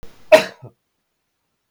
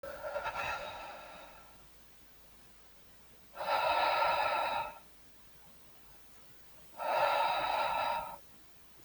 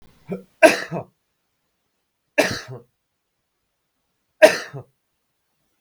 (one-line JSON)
{"cough_length": "1.7 s", "cough_amplitude": 32768, "cough_signal_mean_std_ratio": 0.21, "exhalation_length": "9.0 s", "exhalation_amplitude": 4842, "exhalation_signal_mean_std_ratio": 0.61, "three_cough_length": "5.8 s", "three_cough_amplitude": 32768, "three_cough_signal_mean_std_ratio": 0.22, "survey_phase": "beta (2021-08-13 to 2022-03-07)", "age": "18-44", "gender": "Male", "wearing_mask": "No", "symptom_cough_any": true, "symptom_sore_throat": true, "symptom_onset": "12 days", "smoker_status": "Never smoked", "respiratory_condition_asthma": false, "respiratory_condition_other": false, "recruitment_source": "REACT", "submission_delay": "0 days", "covid_test_result": "Negative", "covid_test_method": "RT-qPCR"}